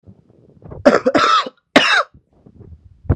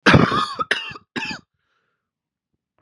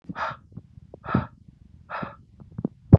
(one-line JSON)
{"three_cough_length": "3.2 s", "three_cough_amplitude": 32768, "three_cough_signal_mean_std_ratio": 0.43, "cough_length": "2.8 s", "cough_amplitude": 31831, "cough_signal_mean_std_ratio": 0.36, "exhalation_length": "3.0 s", "exhalation_amplitude": 32767, "exhalation_signal_mean_std_ratio": 0.24, "survey_phase": "beta (2021-08-13 to 2022-03-07)", "age": "18-44", "gender": "Male", "wearing_mask": "No", "symptom_cough_any": true, "symptom_runny_or_blocked_nose": true, "symptom_onset": "5 days", "smoker_status": "Ex-smoker", "respiratory_condition_asthma": false, "respiratory_condition_other": false, "recruitment_source": "REACT", "submission_delay": "1 day", "covid_test_result": "Negative", "covid_test_method": "RT-qPCR", "influenza_a_test_result": "Negative", "influenza_b_test_result": "Negative"}